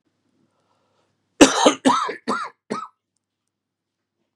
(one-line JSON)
{"cough_length": "4.4 s", "cough_amplitude": 32768, "cough_signal_mean_std_ratio": 0.29, "survey_phase": "beta (2021-08-13 to 2022-03-07)", "age": "45-64", "gender": "Male", "wearing_mask": "No", "symptom_new_continuous_cough": true, "symptom_runny_or_blocked_nose": true, "symptom_sore_throat": true, "symptom_abdominal_pain": true, "symptom_diarrhoea": true, "symptom_fatigue": true, "symptom_fever_high_temperature": true, "symptom_headache": true, "symptom_change_to_sense_of_smell_or_taste": true, "symptom_other": true, "symptom_onset": "2 days", "smoker_status": "Never smoked", "respiratory_condition_asthma": false, "respiratory_condition_other": false, "recruitment_source": "Test and Trace", "submission_delay": "2 days", "covid_test_result": "Positive", "covid_test_method": "RT-qPCR", "covid_ct_value": 22.9, "covid_ct_gene": "ORF1ab gene"}